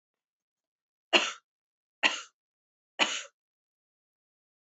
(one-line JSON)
{"three_cough_length": "4.8 s", "three_cough_amplitude": 16704, "three_cough_signal_mean_std_ratio": 0.22, "survey_phase": "beta (2021-08-13 to 2022-03-07)", "age": "45-64", "gender": "Female", "wearing_mask": "No", "symptom_none": true, "smoker_status": "Never smoked", "respiratory_condition_asthma": false, "respiratory_condition_other": false, "recruitment_source": "REACT", "submission_delay": "2 days", "covid_test_result": "Negative", "covid_test_method": "RT-qPCR", "influenza_a_test_result": "Negative", "influenza_b_test_result": "Negative"}